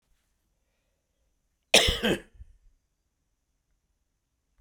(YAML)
cough_length: 4.6 s
cough_amplitude: 26010
cough_signal_mean_std_ratio: 0.21
survey_phase: beta (2021-08-13 to 2022-03-07)
age: 65+
gender: Male
wearing_mask: 'No'
symptom_runny_or_blocked_nose: true
smoker_status: Never smoked
respiratory_condition_asthma: false
respiratory_condition_other: false
recruitment_source: REACT
submission_delay: 1 day
covid_test_result: Negative
covid_test_method: RT-qPCR
influenza_a_test_result: Negative
influenza_b_test_result: Negative